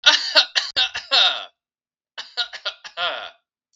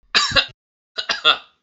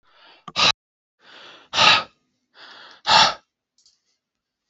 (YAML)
three_cough_length: 3.8 s
three_cough_amplitude: 32768
three_cough_signal_mean_std_ratio: 0.44
cough_length: 1.6 s
cough_amplitude: 32660
cough_signal_mean_std_ratio: 0.43
exhalation_length: 4.7 s
exhalation_amplitude: 29353
exhalation_signal_mean_std_ratio: 0.31
survey_phase: beta (2021-08-13 to 2022-03-07)
age: 18-44
gender: Male
wearing_mask: 'No'
symptom_none: true
smoker_status: Never smoked
respiratory_condition_asthma: false
respiratory_condition_other: false
recruitment_source: REACT
submission_delay: 1 day
covid_test_result: Negative
covid_test_method: RT-qPCR
influenza_a_test_result: Unknown/Void
influenza_b_test_result: Unknown/Void